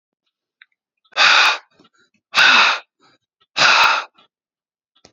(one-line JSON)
{"exhalation_length": "5.1 s", "exhalation_amplitude": 31817, "exhalation_signal_mean_std_ratio": 0.42, "survey_phase": "beta (2021-08-13 to 2022-03-07)", "age": "45-64", "gender": "Male", "wearing_mask": "No", "symptom_runny_or_blocked_nose": true, "symptom_sore_throat": true, "smoker_status": "Ex-smoker", "respiratory_condition_asthma": false, "respiratory_condition_other": false, "recruitment_source": "Test and Trace", "submission_delay": "2 days", "covid_test_result": "Positive", "covid_test_method": "RT-qPCR", "covid_ct_value": 20.1, "covid_ct_gene": "N gene"}